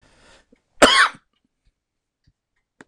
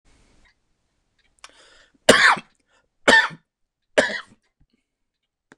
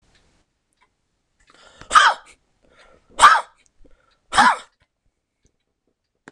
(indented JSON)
{
  "cough_length": "2.9 s",
  "cough_amplitude": 26028,
  "cough_signal_mean_std_ratio": 0.24,
  "three_cough_length": "5.6 s",
  "three_cough_amplitude": 26028,
  "three_cough_signal_mean_std_ratio": 0.26,
  "exhalation_length": "6.3 s",
  "exhalation_amplitude": 26028,
  "exhalation_signal_mean_std_ratio": 0.25,
  "survey_phase": "beta (2021-08-13 to 2022-03-07)",
  "age": "65+",
  "gender": "Male",
  "wearing_mask": "No",
  "symptom_cough_any": true,
  "symptom_runny_or_blocked_nose": true,
  "smoker_status": "Never smoked",
  "respiratory_condition_asthma": false,
  "respiratory_condition_other": false,
  "recruitment_source": "Test and Trace",
  "submission_delay": "1 day",
  "covid_test_result": "Negative",
  "covid_test_method": "RT-qPCR"
}